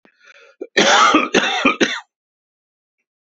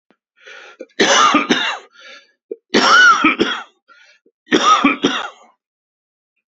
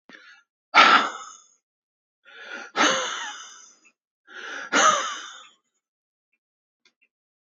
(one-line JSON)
{"cough_length": "3.3 s", "cough_amplitude": 30179, "cough_signal_mean_std_ratio": 0.46, "three_cough_length": "6.5 s", "three_cough_amplitude": 31733, "three_cough_signal_mean_std_ratio": 0.48, "exhalation_length": "7.6 s", "exhalation_amplitude": 27525, "exhalation_signal_mean_std_ratio": 0.33, "survey_phase": "beta (2021-08-13 to 2022-03-07)", "age": "65+", "gender": "Male", "wearing_mask": "No", "symptom_cough_any": true, "symptom_runny_or_blocked_nose": true, "symptom_shortness_of_breath": true, "symptom_sore_throat": true, "symptom_fatigue": true, "symptom_fever_high_temperature": true, "smoker_status": "Ex-smoker", "respiratory_condition_asthma": false, "respiratory_condition_other": false, "recruitment_source": "Test and Trace", "submission_delay": "5 days", "covid_test_result": "Positive", "covid_test_method": "LFT"}